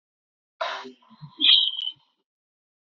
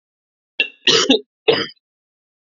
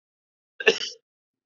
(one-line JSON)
{"exhalation_length": "2.8 s", "exhalation_amplitude": 22804, "exhalation_signal_mean_std_ratio": 0.34, "three_cough_length": "2.5 s", "three_cough_amplitude": 29795, "three_cough_signal_mean_std_ratio": 0.36, "cough_length": "1.5 s", "cough_amplitude": 22954, "cough_signal_mean_std_ratio": 0.23, "survey_phase": "beta (2021-08-13 to 2022-03-07)", "age": "18-44", "gender": "Male", "wearing_mask": "No", "symptom_none": true, "smoker_status": "Never smoked", "respiratory_condition_asthma": false, "respiratory_condition_other": false, "recruitment_source": "REACT", "submission_delay": "1 day", "covid_test_result": "Negative", "covid_test_method": "RT-qPCR", "influenza_a_test_result": "Negative", "influenza_b_test_result": "Negative"}